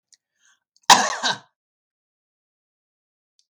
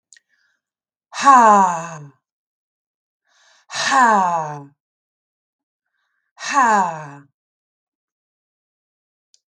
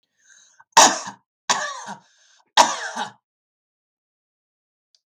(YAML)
cough_length: 3.5 s
cough_amplitude: 32768
cough_signal_mean_std_ratio: 0.2
exhalation_length: 9.5 s
exhalation_amplitude: 32768
exhalation_signal_mean_std_ratio: 0.34
three_cough_length: 5.1 s
three_cough_amplitude: 32766
three_cough_signal_mean_std_ratio: 0.26
survey_phase: beta (2021-08-13 to 2022-03-07)
age: 65+
gender: Female
wearing_mask: 'No'
symptom_none: true
smoker_status: Never smoked
respiratory_condition_asthma: false
respiratory_condition_other: false
recruitment_source: REACT
submission_delay: 5 days
covid_test_result: Negative
covid_test_method: RT-qPCR
influenza_a_test_result: Negative
influenza_b_test_result: Negative